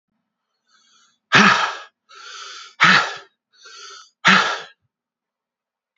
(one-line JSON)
{"exhalation_length": "6.0 s", "exhalation_amplitude": 32767, "exhalation_signal_mean_std_ratio": 0.34, "survey_phase": "beta (2021-08-13 to 2022-03-07)", "age": "45-64", "gender": "Male", "wearing_mask": "No", "symptom_cough_any": true, "symptom_runny_or_blocked_nose": true, "symptom_onset": "7 days", "smoker_status": "Never smoked", "respiratory_condition_asthma": true, "respiratory_condition_other": false, "recruitment_source": "Test and Trace", "submission_delay": "3 days", "covid_test_result": "Negative", "covid_test_method": "LAMP"}